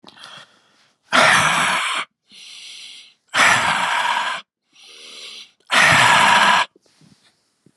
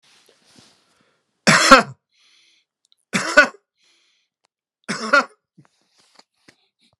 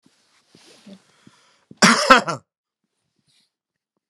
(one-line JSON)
{"exhalation_length": "7.8 s", "exhalation_amplitude": 29660, "exhalation_signal_mean_std_ratio": 0.53, "three_cough_length": "7.0 s", "three_cough_amplitude": 32768, "three_cough_signal_mean_std_ratio": 0.25, "cough_length": "4.1 s", "cough_amplitude": 32768, "cough_signal_mean_std_ratio": 0.23, "survey_phase": "beta (2021-08-13 to 2022-03-07)", "age": "65+", "gender": "Male", "wearing_mask": "No", "symptom_none": true, "smoker_status": "Never smoked", "respiratory_condition_asthma": false, "respiratory_condition_other": false, "recruitment_source": "REACT", "submission_delay": "2 days", "covid_test_result": "Negative", "covid_test_method": "RT-qPCR"}